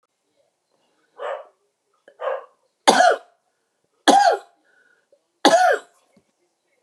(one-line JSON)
{"three_cough_length": "6.8 s", "three_cough_amplitude": 32768, "three_cough_signal_mean_std_ratio": 0.33, "survey_phase": "beta (2021-08-13 to 2022-03-07)", "age": "65+", "gender": "Female", "wearing_mask": "No", "symptom_cough_any": true, "smoker_status": "Never smoked", "respiratory_condition_asthma": false, "respiratory_condition_other": false, "recruitment_source": "REACT", "submission_delay": "5 days", "covid_test_result": "Negative", "covid_test_method": "RT-qPCR", "influenza_a_test_result": "Negative", "influenza_b_test_result": "Negative"}